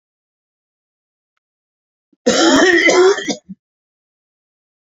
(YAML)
cough_length: 4.9 s
cough_amplitude: 32706
cough_signal_mean_std_ratio: 0.38
survey_phase: beta (2021-08-13 to 2022-03-07)
age: 65+
gender: Male
wearing_mask: 'No'
symptom_cough_any: true
symptom_runny_or_blocked_nose: true
symptom_sore_throat: true
symptom_fever_high_temperature: true
symptom_onset: 2 days
smoker_status: Never smoked
respiratory_condition_asthma: false
respiratory_condition_other: false
recruitment_source: Test and Trace
submission_delay: 1 day
covid_test_result: Positive
covid_test_method: RT-qPCR
covid_ct_value: 14.3
covid_ct_gene: ORF1ab gene
covid_ct_mean: 14.8
covid_viral_load: 14000000 copies/ml
covid_viral_load_category: High viral load (>1M copies/ml)